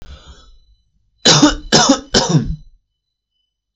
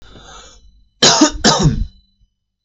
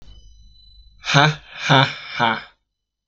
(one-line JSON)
{"three_cough_length": "3.8 s", "three_cough_amplitude": 32768, "three_cough_signal_mean_std_ratio": 0.42, "cough_length": "2.6 s", "cough_amplitude": 32768, "cough_signal_mean_std_ratio": 0.44, "exhalation_length": "3.1 s", "exhalation_amplitude": 32767, "exhalation_signal_mean_std_ratio": 0.42, "survey_phase": "beta (2021-08-13 to 2022-03-07)", "age": "18-44", "gender": "Male", "wearing_mask": "No", "symptom_none": true, "smoker_status": "Ex-smoker", "respiratory_condition_asthma": false, "respiratory_condition_other": false, "recruitment_source": "REACT", "submission_delay": "6 days", "covid_test_result": "Negative", "covid_test_method": "RT-qPCR", "influenza_a_test_result": "Negative", "influenza_b_test_result": "Negative"}